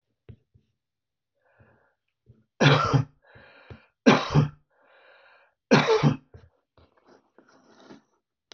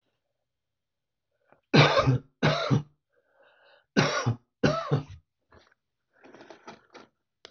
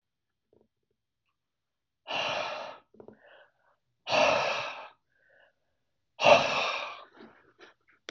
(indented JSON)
{
  "three_cough_length": "8.5 s",
  "three_cough_amplitude": 23675,
  "three_cough_signal_mean_std_ratio": 0.3,
  "cough_length": "7.5 s",
  "cough_amplitude": 18767,
  "cough_signal_mean_std_ratio": 0.35,
  "exhalation_length": "8.1 s",
  "exhalation_amplitude": 17761,
  "exhalation_signal_mean_std_ratio": 0.34,
  "survey_phase": "beta (2021-08-13 to 2022-03-07)",
  "age": "45-64",
  "gender": "Male",
  "wearing_mask": "No",
  "symptom_none": true,
  "smoker_status": "Never smoked",
  "respiratory_condition_asthma": false,
  "respiratory_condition_other": false,
  "recruitment_source": "REACT",
  "submission_delay": "1 day",
  "covid_test_result": "Negative",
  "covid_test_method": "RT-qPCR"
}